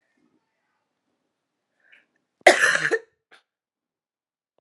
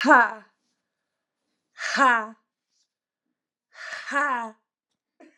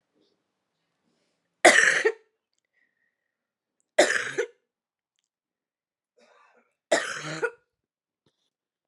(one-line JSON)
{"cough_length": "4.6 s", "cough_amplitude": 32768, "cough_signal_mean_std_ratio": 0.21, "exhalation_length": "5.4 s", "exhalation_amplitude": 25473, "exhalation_signal_mean_std_ratio": 0.33, "three_cough_length": "8.9 s", "three_cough_amplitude": 27894, "three_cough_signal_mean_std_ratio": 0.25, "survey_phase": "beta (2021-08-13 to 2022-03-07)", "age": "45-64", "gender": "Female", "wearing_mask": "No", "symptom_cough_any": true, "symptom_runny_or_blocked_nose": true, "symptom_sore_throat": true, "symptom_abdominal_pain": true, "symptom_fatigue": true, "symptom_headache": true, "symptom_change_to_sense_of_smell_or_taste": true, "symptom_onset": "3 days", "smoker_status": "Current smoker (1 to 10 cigarettes per day)", "respiratory_condition_asthma": true, "respiratory_condition_other": false, "recruitment_source": "Test and Trace", "submission_delay": "2 days", "covid_test_result": "Positive", "covid_test_method": "RT-qPCR", "covid_ct_value": 23.5, "covid_ct_gene": "S gene", "covid_ct_mean": 24.2, "covid_viral_load": "11000 copies/ml", "covid_viral_load_category": "Low viral load (10K-1M copies/ml)"}